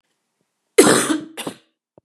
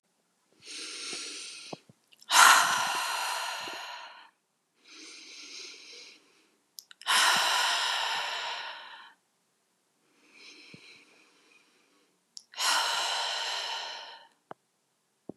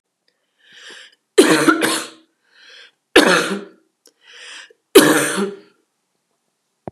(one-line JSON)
{"cough_length": "2.0 s", "cough_amplitude": 32768, "cough_signal_mean_std_ratio": 0.35, "exhalation_length": "15.4 s", "exhalation_amplitude": 18732, "exhalation_signal_mean_std_ratio": 0.43, "three_cough_length": "6.9 s", "three_cough_amplitude": 32768, "three_cough_signal_mean_std_ratio": 0.36, "survey_phase": "beta (2021-08-13 to 2022-03-07)", "age": "45-64", "gender": "Male", "wearing_mask": "No", "symptom_runny_or_blocked_nose": true, "symptom_shortness_of_breath": true, "symptom_abdominal_pain": true, "symptom_diarrhoea": true, "symptom_fatigue": true, "symptom_onset": "8 days", "smoker_status": "Never smoked", "respiratory_condition_asthma": false, "respiratory_condition_other": false, "recruitment_source": "Test and Trace", "submission_delay": "3 days", "covid_test_result": "Negative", "covid_test_method": "ePCR"}